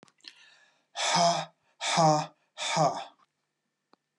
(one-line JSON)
{"exhalation_length": "4.2 s", "exhalation_amplitude": 10638, "exhalation_signal_mean_std_ratio": 0.45, "survey_phase": "beta (2021-08-13 to 2022-03-07)", "age": "45-64", "gender": "Male", "wearing_mask": "No", "symptom_cough_any": true, "symptom_onset": "3 days", "smoker_status": "Ex-smoker", "respiratory_condition_asthma": false, "respiratory_condition_other": false, "recruitment_source": "Test and Trace", "submission_delay": "2 days", "covid_test_result": "Positive", "covid_test_method": "RT-qPCR"}